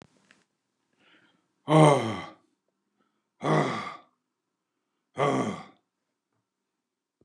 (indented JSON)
{
  "exhalation_length": "7.2 s",
  "exhalation_amplitude": 20104,
  "exhalation_signal_mean_std_ratio": 0.3,
  "survey_phase": "beta (2021-08-13 to 2022-03-07)",
  "age": "65+",
  "gender": "Male",
  "wearing_mask": "No",
  "symptom_runny_or_blocked_nose": true,
  "smoker_status": "Ex-smoker",
  "respiratory_condition_asthma": false,
  "respiratory_condition_other": false,
  "recruitment_source": "REACT",
  "submission_delay": "0 days",
  "covid_test_result": "Negative",
  "covid_test_method": "RT-qPCR",
  "influenza_a_test_result": "Negative",
  "influenza_b_test_result": "Negative"
}